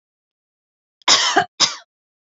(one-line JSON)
{"cough_length": "2.4 s", "cough_amplitude": 30544, "cough_signal_mean_std_ratio": 0.34, "survey_phase": "beta (2021-08-13 to 2022-03-07)", "age": "18-44", "gender": "Female", "wearing_mask": "No", "symptom_none": true, "smoker_status": "Never smoked", "respiratory_condition_asthma": false, "respiratory_condition_other": false, "recruitment_source": "REACT", "submission_delay": "1 day", "covid_test_result": "Negative", "covid_test_method": "RT-qPCR"}